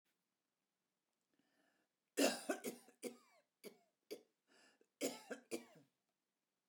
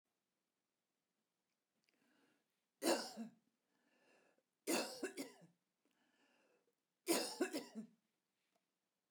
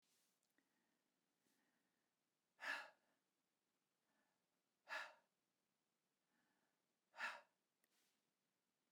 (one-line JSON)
{"cough_length": "6.7 s", "cough_amplitude": 2385, "cough_signal_mean_std_ratio": 0.26, "three_cough_length": "9.1 s", "three_cough_amplitude": 2254, "three_cough_signal_mean_std_ratio": 0.3, "exhalation_length": "8.9 s", "exhalation_amplitude": 491, "exhalation_signal_mean_std_ratio": 0.23, "survey_phase": "beta (2021-08-13 to 2022-03-07)", "age": "45-64", "gender": "Female", "wearing_mask": "No", "symptom_none": true, "smoker_status": "Never smoked", "respiratory_condition_asthma": false, "respiratory_condition_other": false, "recruitment_source": "REACT", "submission_delay": "1 day", "covid_test_result": "Negative", "covid_test_method": "RT-qPCR", "influenza_a_test_result": "Negative", "influenza_b_test_result": "Negative"}